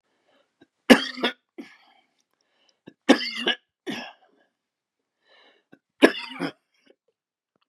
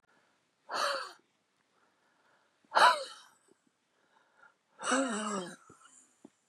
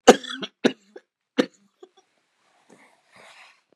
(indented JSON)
{
  "three_cough_length": "7.7 s",
  "three_cough_amplitude": 32768,
  "three_cough_signal_mean_std_ratio": 0.21,
  "exhalation_length": "6.5 s",
  "exhalation_amplitude": 9357,
  "exhalation_signal_mean_std_ratio": 0.31,
  "cough_length": "3.8 s",
  "cough_amplitude": 32768,
  "cough_signal_mean_std_ratio": 0.17,
  "survey_phase": "beta (2021-08-13 to 2022-03-07)",
  "age": "65+",
  "gender": "Male",
  "wearing_mask": "No",
  "symptom_cough_any": true,
  "symptom_runny_or_blocked_nose": true,
  "symptom_shortness_of_breath": true,
  "symptom_sore_throat": true,
  "symptom_onset": "3 days",
  "smoker_status": "Ex-smoker",
  "respiratory_condition_asthma": false,
  "respiratory_condition_other": true,
  "recruitment_source": "Test and Trace",
  "submission_delay": "2 days",
  "covid_test_result": "Positive",
  "covid_test_method": "LAMP"
}